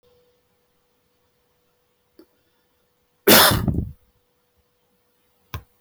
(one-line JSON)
{"cough_length": "5.8 s", "cough_amplitude": 25768, "cough_signal_mean_std_ratio": 0.23, "survey_phase": "beta (2021-08-13 to 2022-03-07)", "age": "45-64", "gender": "Male", "wearing_mask": "No", "symptom_none": true, "smoker_status": "Never smoked", "respiratory_condition_asthma": false, "respiratory_condition_other": false, "recruitment_source": "REACT", "submission_delay": "1 day", "covid_test_result": "Negative", "covid_test_method": "RT-qPCR"}